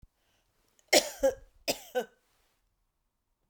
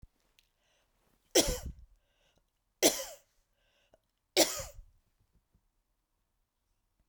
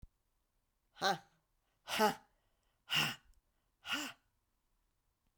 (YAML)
cough_length: 3.5 s
cough_amplitude: 12470
cough_signal_mean_std_ratio: 0.26
three_cough_length: 7.1 s
three_cough_amplitude: 11424
three_cough_signal_mean_std_ratio: 0.22
exhalation_length: 5.4 s
exhalation_amplitude: 3841
exhalation_signal_mean_std_ratio: 0.31
survey_phase: beta (2021-08-13 to 2022-03-07)
age: 45-64
gender: Female
wearing_mask: 'No'
symptom_runny_or_blocked_nose: true
symptom_shortness_of_breath: true
symptom_fatigue: true
symptom_headache: true
smoker_status: Never smoked
respiratory_condition_asthma: false
respiratory_condition_other: false
recruitment_source: REACT
submission_delay: 2 days
covid_test_result: Positive
covid_test_method: RT-qPCR
covid_ct_value: 29.0
covid_ct_gene: N gene